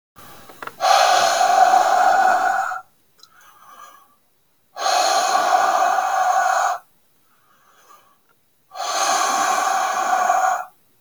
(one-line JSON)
{"exhalation_length": "11.0 s", "exhalation_amplitude": 25808, "exhalation_signal_mean_std_ratio": 0.69, "survey_phase": "beta (2021-08-13 to 2022-03-07)", "age": "45-64", "gender": "Male", "wearing_mask": "No", "symptom_runny_or_blocked_nose": true, "smoker_status": "Never smoked", "respiratory_condition_asthma": false, "respiratory_condition_other": false, "recruitment_source": "REACT", "submission_delay": "1 day", "covid_test_result": "Negative", "covid_test_method": "RT-qPCR"}